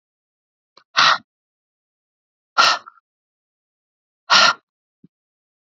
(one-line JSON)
{"exhalation_length": "5.6 s", "exhalation_amplitude": 32768, "exhalation_signal_mean_std_ratio": 0.26, "survey_phase": "beta (2021-08-13 to 2022-03-07)", "age": "45-64", "gender": "Female", "wearing_mask": "No", "symptom_cough_any": true, "symptom_runny_or_blocked_nose": true, "symptom_sore_throat": true, "smoker_status": "Never smoked", "recruitment_source": "Test and Trace", "submission_delay": "1 day", "covid_test_result": "Positive", "covid_test_method": "LFT"}